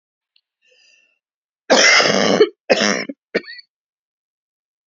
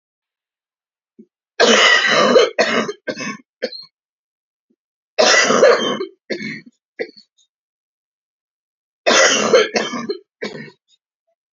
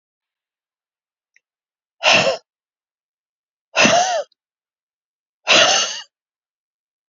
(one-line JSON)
{"cough_length": "4.9 s", "cough_amplitude": 32625, "cough_signal_mean_std_ratio": 0.38, "three_cough_length": "11.5 s", "three_cough_amplitude": 32767, "three_cough_signal_mean_std_ratio": 0.44, "exhalation_length": "7.1 s", "exhalation_amplitude": 30198, "exhalation_signal_mean_std_ratio": 0.33, "survey_phase": "beta (2021-08-13 to 2022-03-07)", "age": "18-44", "gender": "Female", "wearing_mask": "No", "symptom_cough_any": true, "smoker_status": "Never smoked", "respiratory_condition_asthma": true, "respiratory_condition_other": true, "recruitment_source": "REACT", "submission_delay": "5 days", "covid_test_result": "Negative", "covid_test_method": "RT-qPCR"}